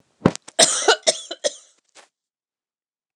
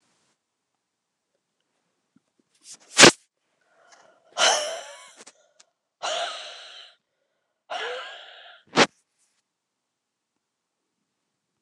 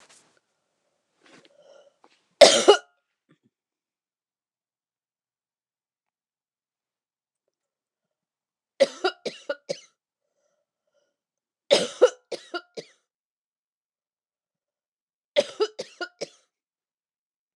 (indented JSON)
{
  "cough_length": "3.2 s",
  "cough_amplitude": 29204,
  "cough_signal_mean_std_ratio": 0.3,
  "exhalation_length": "11.6 s",
  "exhalation_amplitude": 29204,
  "exhalation_signal_mean_std_ratio": 0.2,
  "three_cough_length": "17.6 s",
  "three_cough_amplitude": 29204,
  "three_cough_signal_mean_std_ratio": 0.17,
  "survey_phase": "beta (2021-08-13 to 2022-03-07)",
  "age": "65+",
  "gender": "Female",
  "wearing_mask": "No",
  "symptom_cough_any": true,
  "symptom_fatigue": true,
  "symptom_headache": true,
  "smoker_status": "Ex-smoker",
  "respiratory_condition_asthma": false,
  "respiratory_condition_other": false,
  "recruitment_source": "Test and Trace",
  "submission_delay": "1 day",
  "covid_test_result": "Negative",
  "covid_test_method": "RT-qPCR"
}